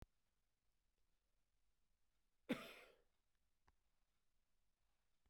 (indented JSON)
{
  "cough_length": "5.3 s",
  "cough_amplitude": 975,
  "cough_signal_mean_std_ratio": 0.2,
  "survey_phase": "beta (2021-08-13 to 2022-03-07)",
  "age": "45-64",
  "gender": "Male",
  "wearing_mask": "No",
  "symptom_none": true,
  "smoker_status": "Ex-smoker",
  "respiratory_condition_asthma": false,
  "respiratory_condition_other": false,
  "recruitment_source": "REACT",
  "submission_delay": "2 days",
  "covid_test_result": "Negative",
  "covid_test_method": "RT-qPCR",
  "influenza_a_test_result": "Unknown/Void",
  "influenza_b_test_result": "Unknown/Void"
}